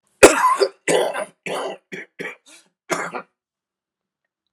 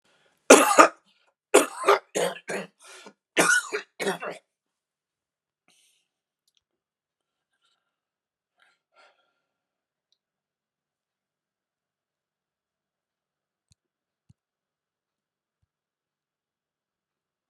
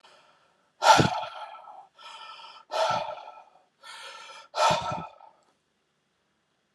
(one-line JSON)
{"cough_length": "4.5 s", "cough_amplitude": 32768, "cough_signal_mean_std_ratio": 0.35, "three_cough_length": "17.5 s", "three_cough_amplitude": 32767, "three_cough_signal_mean_std_ratio": 0.18, "exhalation_length": "6.7 s", "exhalation_amplitude": 21986, "exhalation_signal_mean_std_ratio": 0.35, "survey_phase": "alpha (2021-03-01 to 2021-08-12)", "age": "65+", "gender": "Male", "wearing_mask": "No", "symptom_shortness_of_breath": true, "symptom_fatigue": true, "symptom_loss_of_taste": true, "symptom_onset": "12 days", "smoker_status": "Ex-smoker", "respiratory_condition_asthma": false, "respiratory_condition_other": true, "recruitment_source": "REACT", "submission_delay": "1 day", "covid_test_result": "Negative", "covid_test_method": "RT-qPCR"}